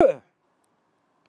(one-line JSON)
{"cough_length": "1.3 s", "cough_amplitude": 18766, "cough_signal_mean_std_ratio": 0.25, "survey_phase": "alpha (2021-03-01 to 2021-08-12)", "age": "45-64", "gender": "Male", "wearing_mask": "No", "symptom_cough_any": true, "symptom_change_to_sense_of_smell_or_taste": true, "symptom_loss_of_taste": true, "symptom_onset": "3 days", "smoker_status": "Never smoked", "respiratory_condition_asthma": false, "respiratory_condition_other": false, "recruitment_source": "Test and Trace", "submission_delay": "2 days", "covid_test_result": "Positive", "covid_test_method": "RT-qPCR", "covid_ct_value": 13.0, "covid_ct_gene": "N gene", "covid_ct_mean": 13.9, "covid_viral_load": "28000000 copies/ml", "covid_viral_load_category": "High viral load (>1M copies/ml)"}